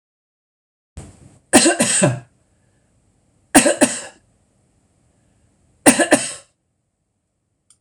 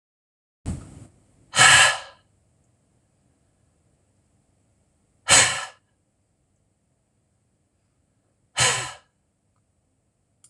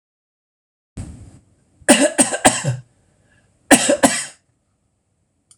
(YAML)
three_cough_length: 7.8 s
three_cough_amplitude: 26028
three_cough_signal_mean_std_ratio: 0.31
exhalation_length: 10.5 s
exhalation_amplitude: 25995
exhalation_signal_mean_std_ratio: 0.24
cough_length: 5.6 s
cough_amplitude: 26028
cough_signal_mean_std_ratio: 0.33
survey_phase: alpha (2021-03-01 to 2021-08-12)
age: 65+
gender: Male
wearing_mask: 'No'
symptom_none: true
smoker_status: Ex-smoker
respiratory_condition_asthma: false
respiratory_condition_other: false
recruitment_source: REACT
submission_delay: 12 days
covid_test_result: Negative
covid_test_method: RT-qPCR